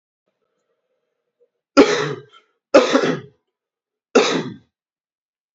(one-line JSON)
{"three_cough_length": "5.5 s", "three_cough_amplitude": 27968, "three_cough_signal_mean_std_ratio": 0.31, "survey_phase": "beta (2021-08-13 to 2022-03-07)", "age": "18-44", "gender": "Male", "wearing_mask": "No", "symptom_runny_or_blocked_nose": true, "symptom_fatigue": true, "symptom_loss_of_taste": true, "symptom_onset": "4 days", "smoker_status": "Never smoked", "respiratory_condition_asthma": false, "respiratory_condition_other": false, "recruitment_source": "Test and Trace", "submission_delay": "2 days", "covid_test_result": "Positive", "covid_test_method": "RT-qPCR", "covid_ct_value": 18.1, "covid_ct_gene": "ORF1ab gene", "covid_ct_mean": 18.9, "covid_viral_load": "640000 copies/ml", "covid_viral_load_category": "Low viral load (10K-1M copies/ml)"}